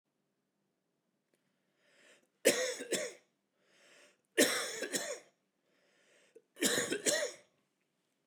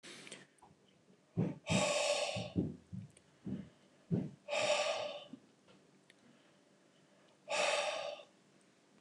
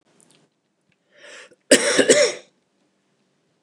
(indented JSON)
{
  "three_cough_length": "8.3 s",
  "three_cough_amplitude": 7624,
  "three_cough_signal_mean_std_ratio": 0.35,
  "exhalation_length": "9.0 s",
  "exhalation_amplitude": 3542,
  "exhalation_signal_mean_std_ratio": 0.51,
  "cough_length": "3.6 s",
  "cough_amplitude": 29203,
  "cough_signal_mean_std_ratio": 0.31,
  "survey_phase": "beta (2021-08-13 to 2022-03-07)",
  "age": "45-64",
  "gender": "Male",
  "wearing_mask": "No",
  "symptom_cough_any": true,
  "smoker_status": "Never smoked",
  "respiratory_condition_asthma": false,
  "respiratory_condition_other": false,
  "recruitment_source": "REACT",
  "submission_delay": "1 day",
  "covid_test_result": "Negative",
  "covid_test_method": "RT-qPCR",
  "influenza_a_test_result": "Negative",
  "influenza_b_test_result": "Negative"
}